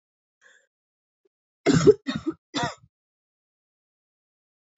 {"three_cough_length": "4.8 s", "three_cough_amplitude": 22079, "three_cough_signal_mean_std_ratio": 0.23, "survey_phase": "beta (2021-08-13 to 2022-03-07)", "age": "18-44", "gender": "Female", "wearing_mask": "No", "symptom_cough_any": true, "symptom_new_continuous_cough": true, "symptom_runny_or_blocked_nose": true, "symptom_shortness_of_breath": true, "symptom_sore_throat": true, "symptom_onset": "3 days", "smoker_status": "Never smoked", "respiratory_condition_asthma": false, "respiratory_condition_other": false, "recruitment_source": "Test and Trace", "submission_delay": "2 days", "covid_test_result": "Positive", "covid_test_method": "ePCR"}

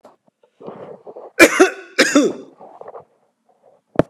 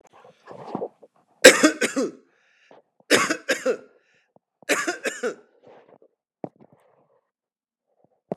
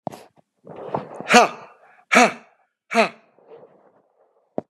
{"cough_length": "4.1 s", "cough_amplitude": 32768, "cough_signal_mean_std_ratio": 0.32, "three_cough_length": "8.4 s", "three_cough_amplitude": 32768, "three_cough_signal_mean_std_ratio": 0.27, "exhalation_length": "4.7 s", "exhalation_amplitude": 32768, "exhalation_signal_mean_std_ratio": 0.29, "survey_phase": "beta (2021-08-13 to 2022-03-07)", "age": "45-64", "gender": "Male", "wearing_mask": "No", "symptom_none": true, "smoker_status": "Never smoked", "respiratory_condition_asthma": false, "respiratory_condition_other": false, "recruitment_source": "REACT", "submission_delay": "2 days", "covid_test_result": "Negative", "covid_test_method": "RT-qPCR", "influenza_a_test_result": "Negative", "influenza_b_test_result": "Negative"}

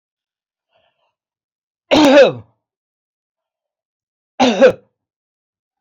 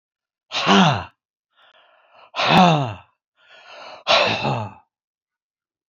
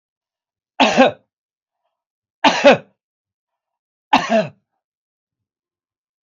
{"cough_length": "5.8 s", "cough_amplitude": 29454, "cough_signal_mean_std_ratio": 0.29, "exhalation_length": "5.9 s", "exhalation_amplitude": 27885, "exhalation_signal_mean_std_ratio": 0.41, "three_cough_length": "6.2 s", "three_cough_amplitude": 28571, "three_cough_signal_mean_std_ratio": 0.28, "survey_phase": "beta (2021-08-13 to 2022-03-07)", "age": "65+", "gender": "Male", "wearing_mask": "No", "symptom_none": true, "smoker_status": "Never smoked", "respiratory_condition_asthma": false, "respiratory_condition_other": false, "recruitment_source": "REACT", "submission_delay": "1 day", "covid_test_result": "Negative", "covid_test_method": "RT-qPCR", "influenza_a_test_result": "Negative", "influenza_b_test_result": "Negative"}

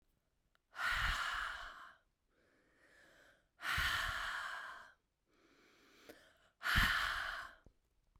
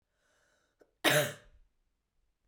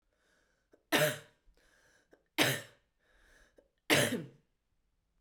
{"exhalation_length": "8.2 s", "exhalation_amplitude": 3881, "exhalation_signal_mean_std_ratio": 0.49, "cough_length": "2.5 s", "cough_amplitude": 7044, "cough_signal_mean_std_ratio": 0.26, "three_cough_length": "5.2 s", "three_cough_amplitude": 8132, "three_cough_signal_mean_std_ratio": 0.3, "survey_phase": "beta (2021-08-13 to 2022-03-07)", "age": "18-44", "gender": "Female", "wearing_mask": "No", "symptom_cough_any": true, "symptom_sore_throat": true, "symptom_onset": "3 days", "smoker_status": "Never smoked", "respiratory_condition_asthma": false, "respiratory_condition_other": false, "recruitment_source": "Test and Trace", "submission_delay": "2 days", "covid_test_result": "Positive", "covid_test_method": "RT-qPCR", "covid_ct_value": 18.3, "covid_ct_gene": "N gene", "covid_ct_mean": 18.7, "covid_viral_load": "710000 copies/ml", "covid_viral_load_category": "Low viral load (10K-1M copies/ml)"}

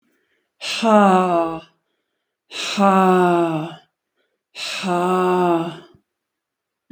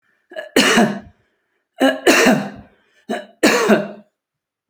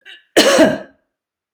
{"exhalation_length": "6.9 s", "exhalation_amplitude": 27517, "exhalation_signal_mean_std_ratio": 0.56, "three_cough_length": "4.7 s", "three_cough_amplitude": 32767, "three_cough_signal_mean_std_ratio": 0.48, "cough_length": "1.5 s", "cough_amplitude": 30405, "cough_signal_mean_std_ratio": 0.44, "survey_phase": "beta (2021-08-13 to 2022-03-07)", "age": "65+", "gender": "Female", "wearing_mask": "No", "symptom_none": true, "smoker_status": "Prefer not to say", "respiratory_condition_asthma": false, "respiratory_condition_other": false, "recruitment_source": "REACT", "submission_delay": "1 day", "covid_test_result": "Negative", "covid_test_method": "RT-qPCR", "influenza_a_test_result": "Negative", "influenza_b_test_result": "Negative"}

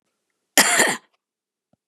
{"cough_length": "1.9 s", "cough_amplitude": 32768, "cough_signal_mean_std_ratio": 0.34, "survey_phase": "beta (2021-08-13 to 2022-03-07)", "age": "45-64", "gender": "Female", "wearing_mask": "No", "symptom_none": true, "smoker_status": "Never smoked", "respiratory_condition_asthma": false, "respiratory_condition_other": false, "recruitment_source": "Test and Trace", "submission_delay": "1 day", "covid_test_result": "Negative", "covid_test_method": "LFT"}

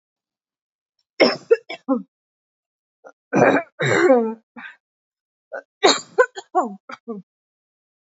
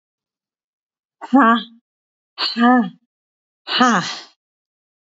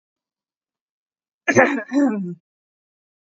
{"three_cough_length": "8.0 s", "three_cough_amplitude": 27859, "three_cough_signal_mean_std_ratio": 0.35, "exhalation_length": "5.0 s", "exhalation_amplitude": 27718, "exhalation_signal_mean_std_ratio": 0.38, "cough_length": "3.2 s", "cough_amplitude": 27288, "cough_signal_mean_std_ratio": 0.36, "survey_phase": "beta (2021-08-13 to 2022-03-07)", "age": "45-64", "gender": "Female", "wearing_mask": "No", "symptom_none": true, "smoker_status": "Ex-smoker", "respiratory_condition_asthma": true, "respiratory_condition_other": false, "recruitment_source": "REACT", "submission_delay": "1 day", "covid_test_result": "Negative", "covid_test_method": "RT-qPCR"}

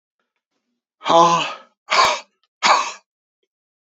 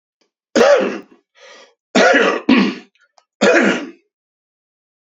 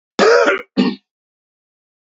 {"exhalation_length": "3.9 s", "exhalation_amplitude": 28436, "exhalation_signal_mean_std_ratio": 0.4, "three_cough_length": "5.0 s", "three_cough_amplitude": 30860, "three_cough_signal_mean_std_ratio": 0.47, "cough_length": "2.0 s", "cough_amplitude": 28227, "cough_signal_mean_std_ratio": 0.44, "survey_phase": "beta (2021-08-13 to 2022-03-07)", "age": "45-64", "gender": "Male", "wearing_mask": "No", "symptom_cough_any": true, "symptom_runny_or_blocked_nose": true, "symptom_shortness_of_breath": true, "symptom_fatigue": true, "symptom_headache": true, "symptom_change_to_sense_of_smell_or_taste": true, "smoker_status": "Ex-smoker", "respiratory_condition_asthma": false, "respiratory_condition_other": false, "recruitment_source": "Test and Trace", "submission_delay": "2 days", "covid_test_result": "Positive", "covid_test_method": "RT-qPCR", "covid_ct_value": 30.4, "covid_ct_gene": "ORF1ab gene"}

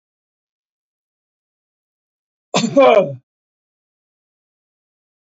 {"cough_length": "5.2 s", "cough_amplitude": 26729, "cough_signal_mean_std_ratio": 0.24, "survey_phase": "beta (2021-08-13 to 2022-03-07)", "age": "45-64", "gender": "Male", "wearing_mask": "No", "symptom_none": true, "smoker_status": "Never smoked", "respiratory_condition_asthma": false, "respiratory_condition_other": false, "recruitment_source": "REACT", "submission_delay": "2 days", "covid_test_result": "Negative", "covid_test_method": "RT-qPCR", "influenza_a_test_result": "Unknown/Void", "influenza_b_test_result": "Unknown/Void"}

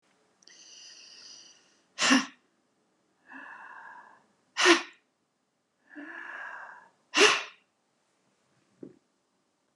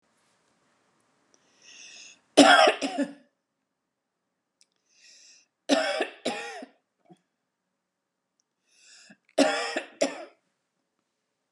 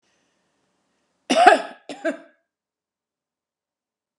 {"exhalation_length": "9.8 s", "exhalation_amplitude": 18487, "exhalation_signal_mean_std_ratio": 0.26, "three_cough_length": "11.5 s", "three_cough_amplitude": 29532, "three_cough_signal_mean_std_ratio": 0.26, "cough_length": "4.2 s", "cough_amplitude": 32768, "cough_signal_mean_std_ratio": 0.23, "survey_phase": "beta (2021-08-13 to 2022-03-07)", "age": "45-64", "gender": "Female", "wearing_mask": "No", "symptom_none": true, "smoker_status": "Ex-smoker", "respiratory_condition_asthma": true, "respiratory_condition_other": false, "recruitment_source": "REACT", "submission_delay": "1 day", "covid_test_result": "Negative", "covid_test_method": "RT-qPCR", "influenza_a_test_result": "Negative", "influenza_b_test_result": "Negative"}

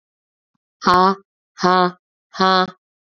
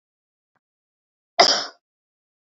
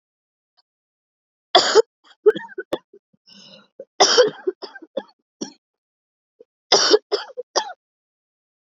{"exhalation_length": "3.2 s", "exhalation_amplitude": 29602, "exhalation_signal_mean_std_ratio": 0.37, "cough_length": "2.5 s", "cough_amplitude": 28810, "cough_signal_mean_std_ratio": 0.22, "three_cough_length": "8.7 s", "three_cough_amplitude": 32010, "three_cough_signal_mean_std_ratio": 0.29, "survey_phase": "beta (2021-08-13 to 2022-03-07)", "age": "45-64", "gender": "Female", "wearing_mask": "No", "symptom_cough_any": true, "symptom_new_continuous_cough": true, "symptom_runny_or_blocked_nose": true, "symptom_sore_throat": true, "symptom_headache": true, "symptom_other": true, "smoker_status": "Never smoked", "respiratory_condition_asthma": false, "respiratory_condition_other": false, "recruitment_source": "Test and Trace", "submission_delay": "2 days", "covid_test_result": "Positive", "covid_test_method": "RT-qPCR", "covid_ct_value": 15.9, "covid_ct_gene": "ORF1ab gene", "covid_ct_mean": 16.4, "covid_viral_load": "4300000 copies/ml", "covid_viral_load_category": "High viral load (>1M copies/ml)"}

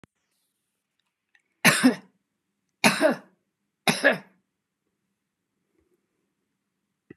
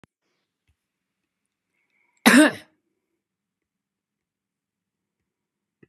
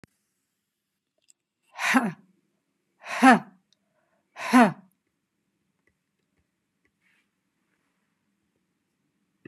{"three_cough_length": "7.2 s", "three_cough_amplitude": 24962, "three_cough_signal_mean_std_ratio": 0.25, "cough_length": "5.9 s", "cough_amplitude": 30940, "cough_signal_mean_std_ratio": 0.17, "exhalation_length": "9.5 s", "exhalation_amplitude": 26033, "exhalation_signal_mean_std_ratio": 0.2, "survey_phase": "beta (2021-08-13 to 2022-03-07)", "age": "65+", "gender": "Female", "wearing_mask": "No", "symptom_none": true, "smoker_status": "Never smoked", "respiratory_condition_asthma": false, "respiratory_condition_other": false, "recruitment_source": "REACT", "submission_delay": "1 day", "covid_test_result": "Negative", "covid_test_method": "RT-qPCR"}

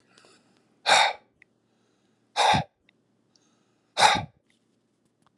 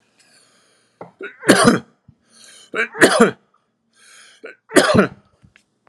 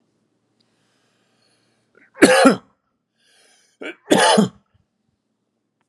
{"exhalation_length": "5.4 s", "exhalation_amplitude": 19374, "exhalation_signal_mean_std_ratio": 0.3, "three_cough_length": "5.9 s", "three_cough_amplitude": 32768, "three_cough_signal_mean_std_ratio": 0.34, "cough_length": "5.9 s", "cough_amplitude": 32768, "cough_signal_mean_std_ratio": 0.28, "survey_phase": "alpha (2021-03-01 to 2021-08-12)", "age": "65+", "gender": "Male", "wearing_mask": "No", "symptom_none": true, "smoker_status": "Never smoked", "respiratory_condition_asthma": true, "respiratory_condition_other": false, "recruitment_source": "REACT", "submission_delay": "2 days", "covid_test_result": "Negative", "covid_test_method": "RT-qPCR"}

